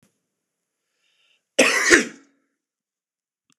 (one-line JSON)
{"cough_length": "3.6 s", "cough_amplitude": 26028, "cough_signal_mean_std_ratio": 0.27, "survey_phase": "beta (2021-08-13 to 2022-03-07)", "age": "45-64", "gender": "Male", "wearing_mask": "No", "symptom_none": true, "smoker_status": "Never smoked", "respiratory_condition_asthma": false, "respiratory_condition_other": false, "recruitment_source": "REACT", "submission_delay": "6 days", "covid_test_result": "Negative", "covid_test_method": "RT-qPCR", "influenza_a_test_result": "Negative", "influenza_b_test_result": "Negative"}